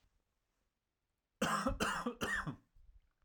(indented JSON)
{
  "cough_length": "3.2 s",
  "cough_amplitude": 2791,
  "cough_signal_mean_std_ratio": 0.47,
  "survey_phase": "alpha (2021-03-01 to 2021-08-12)",
  "age": "18-44",
  "gender": "Male",
  "wearing_mask": "No",
  "symptom_none": true,
  "smoker_status": "Never smoked",
  "respiratory_condition_asthma": true,
  "respiratory_condition_other": false,
  "recruitment_source": "REACT",
  "submission_delay": "2 days",
  "covid_test_result": "Negative",
  "covid_test_method": "RT-qPCR"
}